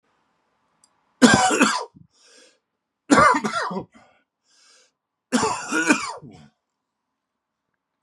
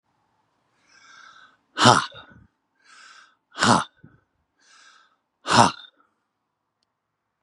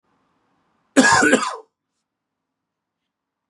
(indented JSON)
{
  "three_cough_length": "8.0 s",
  "three_cough_amplitude": 32534,
  "three_cough_signal_mean_std_ratio": 0.36,
  "exhalation_length": "7.4 s",
  "exhalation_amplitude": 32744,
  "exhalation_signal_mean_std_ratio": 0.24,
  "cough_length": "3.5 s",
  "cough_amplitude": 32767,
  "cough_signal_mean_std_ratio": 0.31,
  "survey_phase": "beta (2021-08-13 to 2022-03-07)",
  "age": "45-64",
  "gender": "Male",
  "wearing_mask": "No",
  "symptom_none": true,
  "smoker_status": "Current smoker (11 or more cigarettes per day)",
  "respiratory_condition_asthma": false,
  "respiratory_condition_other": false,
  "recruitment_source": "REACT",
  "submission_delay": "1 day",
  "covid_test_result": "Negative",
  "covid_test_method": "RT-qPCR",
  "influenza_a_test_result": "Negative",
  "influenza_b_test_result": "Negative"
}